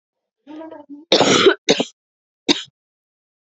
{
  "cough_length": "3.4 s",
  "cough_amplitude": 32768,
  "cough_signal_mean_std_ratio": 0.36,
  "survey_phase": "beta (2021-08-13 to 2022-03-07)",
  "age": "18-44",
  "gender": "Female",
  "wearing_mask": "No",
  "symptom_cough_any": true,
  "symptom_runny_or_blocked_nose": true,
  "symptom_shortness_of_breath": true,
  "symptom_abdominal_pain": true,
  "symptom_diarrhoea": true,
  "symptom_fatigue": true,
  "symptom_headache": true,
  "symptom_change_to_sense_of_smell_or_taste": true,
  "symptom_loss_of_taste": true,
  "symptom_onset": "2 days",
  "smoker_status": "Ex-smoker",
  "respiratory_condition_asthma": false,
  "respiratory_condition_other": false,
  "recruitment_source": "Test and Trace",
  "submission_delay": "1 day",
  "covid_test_result": "Positive",
  "covid_test_method": "RT-qPCR",
  "covid_ct_value": 15.3,
  "covid_ct_gene": "ORF1ab gene",
  "covid_ct_mean": 15.4,
  "covid_viral_load": "8600000 copies/ml",
  "covid_viral_load_category": "High viral load (>1M copies/ml)"
}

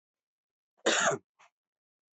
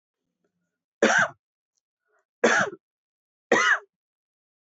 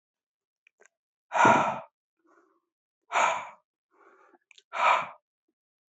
{
  "cough_length": "2.1 s",
  "cough_amplitude": 7987,
  "cough_signal_mean_std_ratio": 0.31,
  "three_cough_length": "4.8 s",
  "three_cough_amplitude": 16516,
  "three_cough_signal_mean_std_ratio": 0.32,
  "exhalation_length": "5.9 s",
  "exhalation_amplitude": 14590,
  "exhalation_signal_mean_std_ratio": 0.32,
  "survey_phase": "beta (2021-08-13 to 2022-03-07)",
  "age": "45-64",
  "gender": "Male",
  "wearing_mask": "No",
  "symptom_headache": true,
  "smoker_status": "Ex-smoker",
  "respiratory_condition_asthma": false,
  "respiratory_condition_other": false,
  "recruitment_source": "REACT",
  "submission_delay": "1 day",
  "covid_test_result": "Negative",
  "covid_test_method": "RT-qPCR"
}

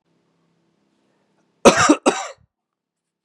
{
  "cough_length": "3.2 s",
  "cough_amplitude": 32768,
  "cough_signal_mean_std_ratio": 0.26,
  "survey_phase": "beta (2021-08-13 to 2022-03-07)",
  "age": "18-44",
  "gender": "Male",
  "wearing_mask": "No",
  "symptom_sore_throat": true,
  "symptom_headache": true,
  "symptom_onset": "11 days",
  "smoker_status": "Never smoked",
  "respiratory_condition_asthma": false,
  "respiratory_condition_other": false,
  "recruitment_source": "REACT",
  "submission_delay": "2 days",
  "covid_test_result": "Negative",
  "covid_test_method": "RT-qPCR"
}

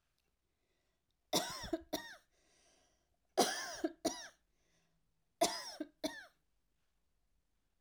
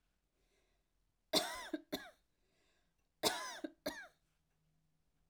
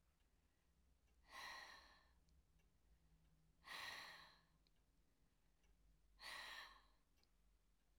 {
  "three_cough_length": "7.8 s",
  "three_cough_amplitude": 5119,
  "three_cough_signal_mean_std_ratio": 0.31,
  "cough_length": "5.3 s",
  "cough_amplitude": 4159,
  "cough_signal_mean_std_ratio": 0.3,
  "exhalation_length": "8.0 s",
  "exhalation_amplitude": 251,
  "exhalation_signal_mean_std_ratio": 0.53,
  "survey_phase": "alpha (2021-03-01 to 2021-08-12)",
  "age": "45-64",
  "gender": "Female",
  "wearing_mask": "No",
  "symptom_none": true,
  "smoker_status": "Never smoked",
  "respiratory_condition_asthma": false,
  "respiratory_condition_other": false,
  "recruitment_source": "REACT",
  "submission_delay": "2 days",
  "covid_test_result": "Negative",
  "covid_test_method": "RT-qPCR"
}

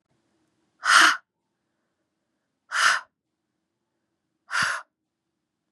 {
  "exhalation_length": "5.7 s",
  "exhalation_amplitude": 24877,
  "exhalation_signal_mean_std_ratio": 0.28,
  "survey_phase": "beta (2021-08-13 to 2022-03-07)",
  "age": "18-44",
  "gender": "Female",
  "wearing_mask": "No",
  "symptom_runny_or_blocked_nose": true,
  "symptom_sore_throat": true,
  "symptom_headache": true,
  "smoker_status": "Never smoked",
  "respiratory_condition_asthma": false,
  "respiratory_condition_other": false,
  "recruitment_source": "Test and Trace",
  "submission_delay": "2 days",
  "covid_test_result": "Positive",
  "covid_test_method": "RT-qPCR"
}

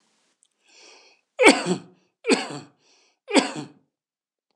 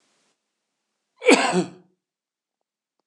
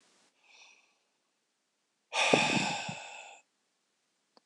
{
  "three_cough_length": "4.6 s",
  "three_cough_amplitude": 26028,
  "three_cough_signal_mean_std_ratio": 0.29,
  "cough_length": "3.1 s",
  "cough_amplitude": 26028,
  "cough_signal_mean_std_ratio": 0.26,
  "exhalation_length": "4.5 s",
  "exhalation_amplitude": 11574,
  "exhalation_signal_mean_std_ratio": 0.34,
  "survey_phase": "beta (2021-08-13 to 2022-03-07)",
  "age": "45-64",
  "gender": "Male",
  "wearing_mask": "No",
  "symptom_sore_throat": true,
  "smoker_status": "Never smoked",
  "respiratory_condition_asthma": true,
  "respiratory_condition_other": false,
  "recruitment_source": "REACT",
  "submission_delay": "1 day",
  "covid_test_result": "Negative",
  "covid_test_method": "RT-qPCR",
  "influenza_a_test_result": "Negative",
  "influenza_b_test_result": "Negative"
}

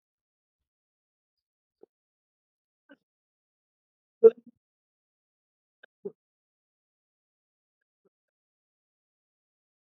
{
  "three_cough_length": "9.9 s",
  "three_cough_amplitude": 18607,
  "three_cough_signal_mean_std_ratio": 0.07,
  "survey_phase": "alpha (2021-03-01 to 2021-08-12)",
  "age": "18-44",
  "gender": "Male",
  "wearing_mask": "No",
  "symptom_none": true,
  "smoker_status": "Prefer not to say",
  "respiratory_condition_asthma": false,
  "respiratory_condition_other": false,
  "recruitment_source": "REACT",
  "submission_delay": "6 days",
  "covid_test_result": "Negative",
  "covid_test_method": "RT-qPCR"
}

